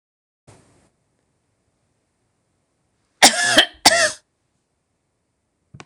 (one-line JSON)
{"cough_length": "5.9 s", "cough_amplitude": 26028, "cough_signal_mean_std_ratio": 0.24, "survey_phase": "beta (2021-08-13 to 2022-03-07)", "age": "65+", "gender": "Female", "wearing_mask": "No", "symptom_none": true, "smoker_status": "Never smoked", "respiratory_condition_asthma": false, "respiratory_condition_other": false, "recruitment_source": "REACT", "submission_delay": "1 day", "covid_test_result": "Negative", "covid_test_method": "RT-qPCR"}